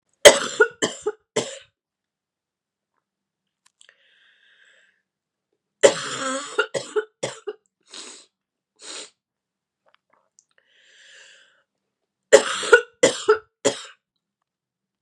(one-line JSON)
{"three_cough_length": "15.0 s", "three_cough_amplitude": 32768, "three_cough_signal_mean_std_ratio": 0.23, "survey_phase": "beta (2021-08-13 to 2022-03-07)", "age": "18-44", "gender": "Female", "wearing_mask": "No", "symptom_cough_any": true, "symptom_runny_or_blocked_nose": true, "symptom_sore_throat": true, "symptom_headache": true, "symptom_onset": "2 days", "smoker_status": "Never smoked", "respiratory_condition_asthma": false, "respiratory_condition_other": false, "recruitment_source": "Test and Trace", "submission_delay": "1 day", "covid_test_result": "Positive", "covid_test_method": "ePCR"}